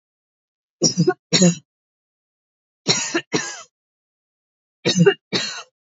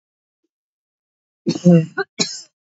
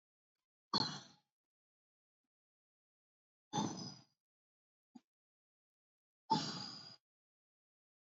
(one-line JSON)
{"three_cough_length": "5.9 s", "three_cough_amplitude": 26862, "three_cough_signal_mean_std_ratio": 0.37, "cough_length": "2.7 s", "cough_amplitude": 26441, "cough_signal_mean_std_ratio": 0.31, "exhalation_length": "8.0 s", "exhalation_amplitude": 2605, "exhalation_signal_mean_std_ratio": 0.26, "survey_phase": "alpha (2021-03-01 to 2021-08-12)", "age": "18-44", "gender": "Female", "wearing_mask": "No", "symptom_none": true, "smoker_status": "Never smoked", "respiratory_condition_asthma": false, "respiratory_condition_other": false, "recruitment_source": "REACT", "submission_delay": "1 day", "covid_test_result": "Negative", "covid_test_method": "RT-qPCR"}